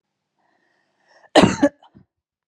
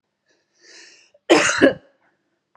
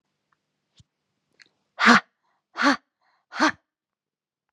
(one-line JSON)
{"cough_length": "2.5 s", "cough_amplitude": 32735, "cough_signal_mean_std_ratio": 0.24, "three_cough_length": "2.6 s", "three_cough_amplitude": 32564, "three_cough_signal_mean_std_ratio": 0.31, "exhalation_length": "4.5 s", "exhalation_amplitude": 25754, "exhalation_signal_mean_std_ratio": 0.25, "survey_phase": "alpha (2021-03-01 to 2021-08-12)", "age": "18-44", "gender": "Female", "wearing_mask": "No", "symptom_none": true, "smoker_status": "Never smoked", "respiratory_condition_asthma": false, "respiratory_condition_other": false, "recruitment_source": "REACT", "submission_delay": "1 day", "covid_test_result": "Negative", "covid_test_method": "RT-qPCR"}